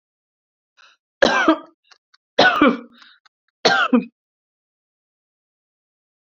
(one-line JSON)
{"three_cough_length": "6.2 s", "three_cough_amplitude": 28058, "three_cough_signal_mean_std_ratio": 0.32, "survey_phase": "beta (2021-08-13 to 2022-03-07)", "age": "45-64", "gender": "Female", "wearing_mask": "No", "symptom_runny_or_blocked_nose": true, "symptom_shortness_of_breath": true, "symptom_sore_throat": true, "symptom_fatigue": true, "symptom_headache": true, "symptom_onset": "3 days", "smoker_status": "Never smoked", "respiratory_condition_asthma": true, "respiratory_condition_other": false, "recruitment_source": "Test and Trace", "submission_delay": "0 days", "covid_test_result": "Positive", "covid_test_method": "RT-qPCR", "covid_ct_value": 18.1, "covid_ct_gene": "N gene"}